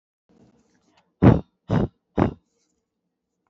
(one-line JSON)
{"exhalation_length": "3.5 s", "exhalation_amplitude": 26245, "exhalation_signal_mean_std_ratio": 0.25, "survey_phase": "beta (2021-08-13 to 2022-03-07)", "age": "18-44", "gender": "Female", "wearing_mask": "No", "symptom_none": true, "symptom_onset": "4 days", "smoker_status": "Never smoked", "respiratory_condition_asthma": false, "respiratory_condition_other": false, "recruitment_source": "REACT", "submission_delay": "2 days", "covid_test_result": "Negative", "covid_test_method": "RT-qPCR", "influenza_a_test_result": "Unknown/Void", "influenza_b_test_result": "Unknown/Void"}